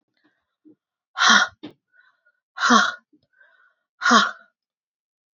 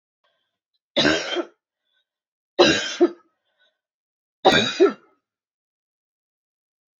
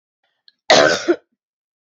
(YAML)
exhalation_length: 5.4 s
exhalation_amplitude: 26983
exhalation_signal_mean_std_ratio: 0.32
three_cough_length: 7.0 s
three_cough_amplitude: 27328
three_cough_signal_mean_std_ratio: 0.31
cough_length: 1.9 s
cough_amplitude: 29336
cough_signal_mean_std_ratio: 0.35
survey_phase: beta (2021-08-13 to 2022-03-07)
age: 45-64
gender: Female
wearing_mask: 'No'
symptom_cough_any: true
symptom_new_continuous_cough: true
symptom_sore_throat: true
symptom_fatigue: true
symptom_onset: 3 days
smoker_status: Never smoked
respiratory_condition_asthma: true
respiratory_condition_other: false
recruitment_source: Test and Trace
submission_delay: 2 days
covid_test_result: Negative
covid_test_method: RT-qPCR